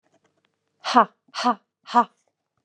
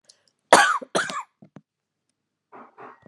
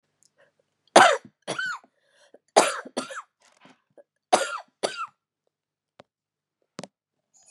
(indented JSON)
{
  "exhalation_length": "2.6 s",
  "exhalation_amplitude": 25897,
  "exhalation_signal_mean_std_ratio": 0.29,
  "cough_length": "3.1 s",
  "cough_amplitude": 32767,
  "cough_signal_mean_std_ratio": 0.28,
  "three_cough_length": "7.5 s",
  "three_cough_amplitude": 31795,
  "three_cough_signal_mean_std_ratio": 0.24,
  "survey_phase": "beta (2021-08-13 to 2022-03-07)",
  "age": "45-64",
  "gender": "Female",
  "wearing_mask": "Yes",
  "symptom_cough_any": true,
  "symptom_fatigue": true,
  "symptom_change_to_sense_of_smell_or_taste": true,
  "symptom_loss_of_taste": true,
  "smoker_status": "Never smoked",
  "respiratory_condition_asthma": false,
  "respiratory_condition_other": false,
  "recruitment_source": "Test and Trace",
  "submission_delay": "2 days",
  "covid_test_result": "Positive",
  "covid_test_method": "RT-qPCR",
  "covid_ct_value": 10.7,
  "covid_ct_gene": "ORF1ab gene",
  "covid_ct_mean": 11.3,
  "covid_viral_load": "200000000 copies/ml",
  "covid_viral_load_category": "High viral load (>1M copies/ml)"
}